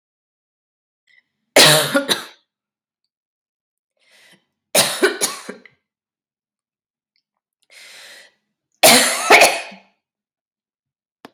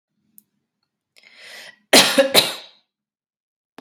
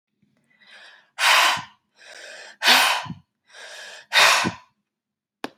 three_cough_length: 11.3 s
three_cough_amplitude: 32768
three_cough_signal_mean_std_ratio: 0.29
cough_length: 3.8 s
cough_amplitude: 32768
cough_signal_mean_std_ratio: 0.28
exhalation_length: 5.6 s
exhalation_amplitude: 29949
exhalation_signal_mean_std_ratio: 0.4
survey_phase: beta (2021-08-13 to 2022-03-07)
age: 18-44
gender: Female
wearing_mask: 'No'
symptom_new_continuous_cough: true
symptom_sore_throat: true
symptom_onset: 2 days
smoker_status: Ex-smoker
respiratory_condition_asthma: false
respiratory_condition_other: false
recruitment_source: Test and Trace
submission_delay: 1 day
covid_test_method: ePCR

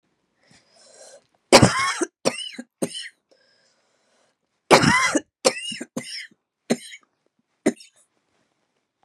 three_cough_length: 9.0 s
three_cough_amplitude: 32768
three_cough_signal_mean_std_ratio: 0.29
survey_phase: beta (2021-08-13 to 2022-03-07)
age: 18-44
gender: Female
wearing_mask: 'No'
symptom_cough_any: true
symptom_sore_throat: true
symptom_fatigue: true
symptom_headache: true
symptom_change_to_sense_of_smell_or_taste: true
symptom_loss_of_taste: true
symptom_onset: 5 days
smoker_status: Never smoked
respiratory_condition_asthma: false
respiratory_condition_other: false
recruitment_source: Test and Trace
submission_delay: 3 days
covid_test_result: Positive
covid_test_method: ePCR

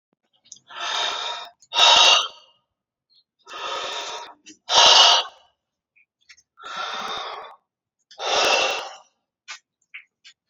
exhalation_length: 10.5 s
exhalation_amplitude: 31391
exhalation_signal_mean_std_ratio: 0.4
survey_phase: alpha (2021-03-01 to 2021-08-12)
age: 45-64
gender: Female
wearing_mask: 'No'
symptom_fatigue: true
symptom_headache: true
symptom_onset: 12 days
smoker_status: Current smoker (1 to 10 cigarettes per day)
respiratory_condition_asthma: false
respiratory_condition_other: false
recruitment_source: REACT
submission_delay: 2 days
covid_test_result: Negative
covid_test_method: RT-qPCR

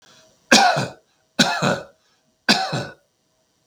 three_cough_length: 3.7 s
three_cough_amplitude: 32768
three_cough_signal_mean_std_ratio: 0.41
survey_phase: beta (2021-08-13 to 2022-03-07)
age: 45-64
gender: Male
wearing_mask: 'No'
symptom_none: true
smoker_status: Ex-smoker
respiratory_condition_asthma: false
respiratory_condition_other: false
recruitment_source: REACT
submission_delay: 5 days
covid_test_result: Negative
covid_test_method: RT-qPCR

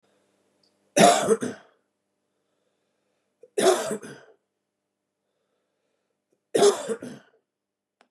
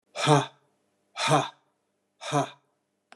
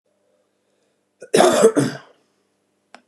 three_cough_length: 8.1 s
three_cough_amplitude: 24720
three_cough_signal_mean_std_ratio: 0.29
exhalation_length: 3.2 s
exhalation_amplitude: 17402
exhalation_signal_mean_std_ratio: 0.38
cough_length: 3.1 s
cough_amplitude: 31142
cough_signal_mean_std_ratio: 0.33
survey_phase: beta (2021-08-13 to 2022-03-07)
age: 45-64
gender: Male
wearing_mask: 'No'
symptom_none: true
smoker_status: Never smoked
respiratory_condition_asthma: false
respiratory_condition_other: false
recruitment_source: Test and Trace
submission_delay: 1 day
covid_test_result: Positive
covid_test_method: RT-qPCR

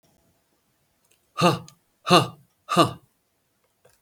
exhalation_length: 4.0 s
exhalation_amplitude: 31045
exhalation_signal_mean_std_ratio: 0.28
survey_phase: beta (2021-08-13 to 2022-03-07)
age: 65+
gender: Male
wearing_mask: 'No'
symptom_cough_any: true
symptom_runny_or_blocked_nose: true
symptom_onset: 12 days
smoker_status: Ex-smoker
respiratory_condition_asthma: false
respiratory_condition_other: false
recruitment_source: REACT
submission_delay: 1 day
covid_test_result: Negative
covid_test_method: RT-qPCR
influenza_a_test_result: Negative
influenza_b_test_result: Negative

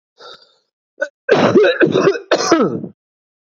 three_cough_length: 3.5 s
three_cough_amplitude: 28800
three_cough_signal_mean_std_ratio: 0.54
survey_phase: beta (2021-08-13 to 2022-03-07)
age: 18-44
gender: Male
wearing_mask: 'No'
symptom_cough_any: true
symptom_shortness_of_breath: true
symptom_fatigue: true
symptom_headache: true
symptom_change_to_sense_of_smell_or_taste: true
smoker_status: Current smoker (1 to 10 cigarettes per day)
respiratory_condition_asthma: false
respiratory_condition_other: false
recruitment_source: Test and Trace
submission_delay: 2 days
covid_test_result: Positive
covid_test_method: RT-qPCR
covid_ct_value: 14.3
covid_ct_gene: N gene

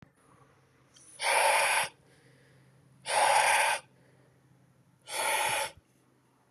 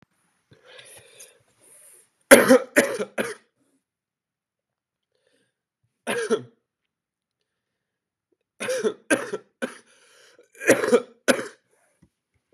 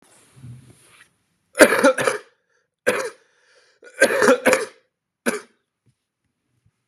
exhalation_length: 6.5 s
exhalation_amplitude: 7820
exhalation_signal_mean_std_ratio: 0.48
three_cough_length: 12.5 s
three_cough_amplitude: 32768
three_cough_signal_mean_std_ratio: 0.25
cough_length: 6.9 s
cough_amplitude: 32768
cough_signal_mean_std_ratio: 0.33
survey_phase: beta (2021-08-13 to 2022-03-07)
age: 18-44
gender: Male
wearing_mask: 'No'
symptom_cough_any: true
symptom_onset: 11 days
smoker_status: Current smoker (1 to 10 cigarettes per day)
respiratory_condition_asthma: false
respiratory_condition_other: false
recruitment_source: REACT
submission_delay: 2 days
covid_test_result: Negative
covid_test_method: RT-qPCR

